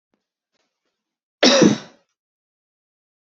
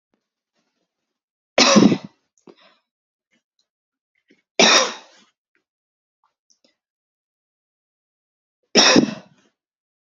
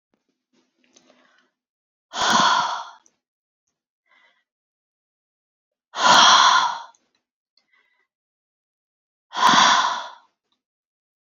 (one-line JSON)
{"cough_length": "3.2 s", "cough_amplitude": 30834, "cough_signal_mean_std_ratio": 0.26, "three_cough_length": "10.2 s", "three_cough_amplitude": 31618, "three_cough_signal_mean_std_ratio": 0.25, "exhalation_length": "11.3 s", "exhalation_amplitude": 29920, "exhalation_signal_mean_std_ratio": 0.33, "survey_phase": "beta (2021-08-13 to 2022-03-07)", "age": "18-44", "gender": "Female", "wearing_mask": "No", "symptom_cough_any": true, "symptom_fatigue": true, "symptom_headache": true, "symptom_onset": "5 days", "smoker_status": "Never smoked", "respiratory_condition_asthma": false, "respiratory_condition_other": false, "recruitment_source": "Test and Trace", "submission_delay": "1 day", "covid_test_result": "Positive", "covid_test_method": "RT-qPCR", "covid_ct_value": 18.4, "covid_ct_gene": "ORF1ab gene"}